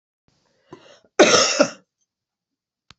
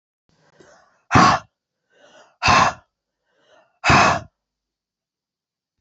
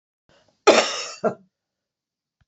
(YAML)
three_cough_length: 3.0 s
three_cough_amplitude: 29941
three_cough_signal_mean_std_ratio: 0.3
exhalation_length: 5.8 s
exhalation_amplitude: 27137
exhalation_signal_mean_std_ratio: 0.32
cough_length: 2.5 s
cough_amplitude: 27840
cough_signal_mean_std_ratio: 0.29
survey_phase: beta (2021-08-13 to 2022-03-07)
age: 45-64
gender: Female
wearing_mask: 'No'
symptom_runny_or_blocked_nose: true
symptom_fatigue: true
symptom_headache: true
symptom_onset: 5 days
smoker_status: Never smoked
respiratory_condition_asthma: false
respiratory_condition_other: false
recruitment_source: Test and Trace
submission_delay: 2 days
covid_test_result: Positive
covid_test_method: RT-qPCR
covid_ct_value: 27.2
covid_ct_gene: ORF1ab gene